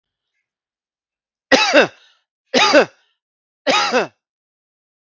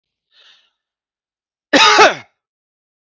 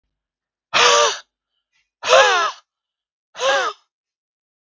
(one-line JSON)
{"three_cough_length": "5.1 s", "three_cough_amplitude": 32767, "three_cough_signal_mean_std_ratio": 0.35, "cough_length": "3.1 s", "cough_amplitude": 32767, "cough_signal_mean_std_ratio": 0.3, "exhalation_length": "4.6 s", "exhalation_amplitude": 32768, "exhalation_signal_mean_std_ratio": 0.4, "survey_phase": "beta (2021-08-13 to 2022-03-07)", "age": "45-64", "gender": "Male", "wearing_mask": "No", "symptom_none": true, "smoker_status": "Ex-smoker", "respiratory_condition_asthma": false, "respiratory_condition_other": false, "recruitment_source": "REACT", "submission_delay": "3 days", "covid_test_result": "Negative", "covid_test_method": "RT-qPCR"}